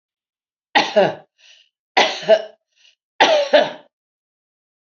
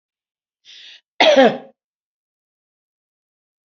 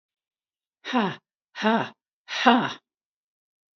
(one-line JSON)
{"three_cough_length": "4.9 s", "three_cough_amplitude": 28984, "three_cough_signal_mean_std_ratio": 0.37, "cough_length": "3.7 s", "cough_amplitude": 29012, "cough_signal_mean_std_ratio": 0.26, "exhalation_length": "3.8 s", "exhalation_amplitude": 26207, "exhalation_signal_mean_std_ratio": 0.35, "survey_phase": "alpha (2021-03-01 to 2021-08-12)", "age": "65+", "gender": "Female", "wearing_mask": "No", "symptom_none": true, "smoker_status": "Ex-smoker", "respiratory_condition_asthma": false, "respiratory_condition_other": false, "recruitment_source": "REACT", "submission_delay": "2 days", "covid_test_result": "Negative", "covid_test_method": "RT-qPCR"}